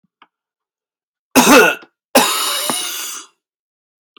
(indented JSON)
{
  "cough_length": "4.2 s",
  "cough_amplitude": 32768,
  "cough_signal_mean_std_ratio": 0.4,
  "survey_phase": "beta (2021-08-13 to 2022-03-07)",
  "age": "45-64",
  "gender": "Male",
  "wearing_mask": "No",
  "symptom_cough_any": true,
  "symptom_runny_or_blocked_nose": true,
  "symptom_sore_throat": true,
  "smoker_status": "Ex-smoker",
  "respiratory_condition_asthma": false,
  "respiratory_condition_other": false,
  "recruitment_source": "Test and Trace",
  "submission_delay": "1 day",
  "covid_test_result": "Positive",
  "covid_test_method": "ePCR"
}